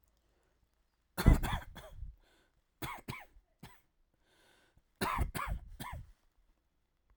{"three_cough_length": "7.2 s", "three_cough_amplitude": 11066, "three_cough_signal_mean_std_ratio": 0.28, "survey_phase": "alpha (2021-03-01 to 2021-08-12)", "age": "18-44", "gender": "Male", "wearing_mask": "No", "symptom_none": true, "smoker_status": "Never smoked", "respiratory_condition_asthma": false, "respiratory_condition_other": false, "recruitment_source": "REACT", "submission_delay": "1 day", "covid_test_result": "Negative", "covid_test_method": "RT-qPCR"}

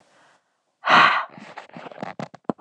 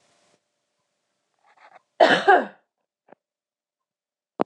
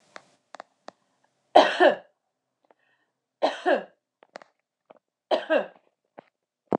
{"exhalation_length": "2.6 s", "exhalation_amplitude": 25118, "exhalation_signal_mean_std_ratio": 0.35, "cough_length": "4.5 s", "cough_amplitude": 24308, "cough_signal_mean_std_ratio": 0.23, "three_cough_length": "6.8 s", "three_cough_amplitude": 25675, "three_cough_signal_mean_std_ratio": 0.26, "survey_phase": "alpha (2021-03-01 to 2021-08-12)", "age": "18-44", "gender": "Female", "wearing_mask": "No", "symptom_none": true, "smoker_status": "Never smoked", "respiratory_condition_asthma": false, "respiratory_condition_other": false, "recruitment_source": "REACT", "submission_delay": "2 days", "covid_test_result": "Negative", "covid_test_method": "RT-qPCR"}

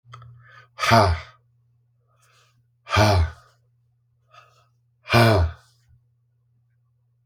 {"exhalation_length": "7.3 s", "exhalation_amplitude": 27658, "exhalation_signal_mean_std_ratio": 0.34, "survey_phase": "beta (2021-08-13 to 2022-03-07)", "age": "45-64", "gender": "Male", "wearing_mask": "No", "symptom_cough_any": true, "symptom_new_continuous_cough": true, "symptom_runny_or_blocked_nose": true, "symptom_sore_throat": true, "symptom_fatigue": true, "symptom_onset": "8 days", "smoker_status": "Never smoked", "respiratory_condition_asthma": false, "respiratory_condition_other": false, "recruitment_source": "Test and Trace", "submission_delay": "2 days", "covid_test_result": "Positive", "covid_test_method": "RT-qPCR", "covid_ct_value": 33.6, "covid_ct_gene": "N gene"}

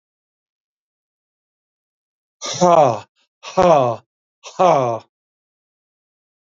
{"exhalation_length": "6.6 s", "exhalation_amplitude": 27973, "exhalation_signal_mean_std_ratio": 0.33, "survey_phase": "beta (2021-08-13 to 2022-03-07)", "age": "45-64", "gender": "Male", "wearing_mask": "No", "symptom_none": true, "smoker_status": "Never smoked", "respiratory_condition_asthma": false, "respiratory_condition_other": false, "recruitment_source": "REACT", "submission_delay": "2 days", "covid_test_result": "Negative", "covid_test_method": "RT-qPCR", "influenza_a_test_result": "Unknown/Void", "influenza_b_test_result": "Unknown/Void"}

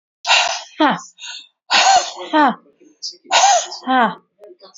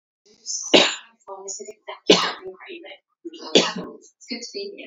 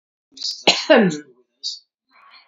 {"exhalation_length": "4.8 s", "exhalation_amplitude": 29684, "exhalation_signal_mean_std_ratio": 0.53, "three_cough_length": "4.9 s", "three_cough_amplitude": 32768, "three_cough_signal_mean_std_ratio": 0.37, "cough_length": "2.5 s", "cough_amplitude": 32689, "cough_signal_mean_std_ratio": 0.37, "survey_phase": "beta (2021-08-13 to 2022-03-07)", "age": "65+", "gender": "Female", "wearing_mask": "No", "symptom_none": true, "smoker_status": "Ex-smoker", "respiratory_condition_asthma": false, "respiratory_condition_other": false, "recruitment_source": "REACT", "submission_delay": "10 days", "covid_test_result": "Negative", "covid_test_method": "RT-qPCR", "influenza_a_test_result": "Negative", "influenza_b_test_result": "Negative"}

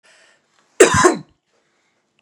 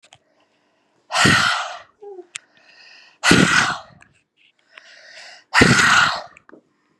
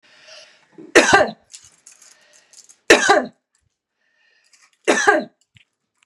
{"cough_length": "2.2 s", "cough_amplitude": 32768, "cough_signal_mean_std_ratio": 0.3, "exhalation_length": "7.0 s", "exhalation_amplitude": 32768, "exhalation_signal_mean_std_ratio": 0.42, "three_cough_length": "6.1 s", "three_cough_amplitude": 32768, "three_cough_signal_mean_std_ratio": 0.31, "survey_phase": "beta (2021-08-13 to 2022-03-07)", "age": "18-44", "gender": "Female", "wearing_mask": "No", "symptom_other": true, "symptom_onset": "12 days", "smoker_status": "Ex-smoker", "respiratory_condition_asthma": false, "respiratory_condition_other": false, "recruitment_source": "REACT", "submission_delay": "1 day", "covid_test_result": "Negative", "covid_test_method": "RT-qPCR", "influenza_a_test_result": "Negative", "influenza_b_test_result": "Negative"}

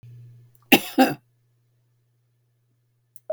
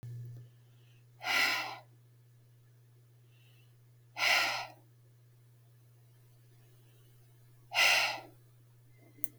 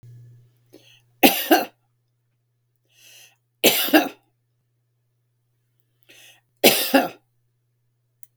{"cough_length": "3.3 s", "cough_amplitude": 32768, "cough_signal_mean_std_ratio": 0.22, "exhalation_length": "9.4 s", "exhalation_amplitude": 12419, "exhalation_signal_mean_std_ratio": 0.37, "three_cough_length": "8.4 s", "three_cough_amplitude": 32768, "three_cough_signal_mean_std_ratio": 0.27, "survey_phase": "beta (2021-08-13 to 2022-03-07)", "age": "65+", "gender": "Female", "wearing_mask": "No", "symptom_none": true, "smoker_status": "Never smoked", "respiratory_condition_asthma": false, "respiratory_condition_other": false, "recruitment_source": "REACT", "submission_delay": "2 days", "covid_test_result": "Negative", "covid_test_method": "RT-qPCR", "influenza_a_test_result": "Negative", "influenza_b_test_result": "Negative"}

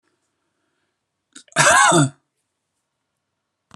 {"cough_length": "3.8 s", "cough_amplitude": 31198, "cough_signal_mean_std_ratio": 0.31, "survey_phase": "alpha (2021-03-01 to 2021-08-12)", "age": "45-64", "gender": "Male", "wearing_mask": "No", "symptom_none": true, "smoker_status": "Never smoked", "respiratory_condition_asthma": true, "respiratory_condition_other": false, "recruitment_source": "REACT", "submission_delay": "3 days", "covid_test_result": "Negative", "covid_test_method": "RT-qPCR"}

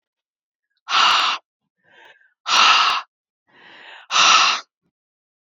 {"exhalation_length": "5.5 s", "exhalation_amplitude": 27410, "exhalation_signal_mean_std_ratio": 0.44, "survey_phase": "beta (2021-08-13 to 2022-03-07)", "age": "18-44", "gender": "Female", "wearing_mask": "No", "symptom_none": true, "smoker_status": "Never smoked", "respiratory_condition_asthma": false, "respiratory_condition_other": false, "recruitment_source": "REACT", "submission_delay": "2 days", "covid_test_result": "Negative", "covid_test_method": "RT-qPCR", "influenza_a_test_result": "Negative", "influenza_b_test_result": "Negative"}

